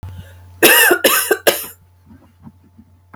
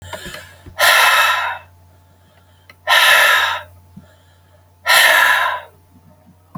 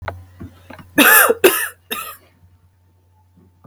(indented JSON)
{
  "cough_length": "3.2 s",
  "cough_amplitude": 32768,
  "cough_signal_mean_std_ratio": 0.44,
  "exhalation_length": "6.6 s",
  "exhalation_amplitude": 32768,
  "exhalation_signal_mean_std_ratio": 0.52,
  "three_cough_length": "3.7 s",
  "three_cough_amplitude": 32768,
  "three_cough_signal_mean_std_ratio": 0.36,
  "survey_phase": "beta (2021-08-13 to 2022-03-07)",
  "age": "45-64",
  "gender": "Female",
  "wearing_mask": "No",
  "symptom_cough_any": true,
  "symptom_runny_or_blocked_nose": true,
  "symptom_sore_throat": true,
  "symptom_diarrhoea": true,
  "symptom_fatigue": true,
  "symptom_change_to_sense_of_smell_or_taste": true,
  "symptom_onset": "5 days",
  "smoker_status": "Never smoked",
  "respiratory_condition_asthma": false,
  "respiratory_condition_other": false,
  "recruitment_source": "Test and Trace",
  "submission_delay": "2 days",
  "covid_test_result": "Positive",
  "covid_test_method": "RT-qPCR"
}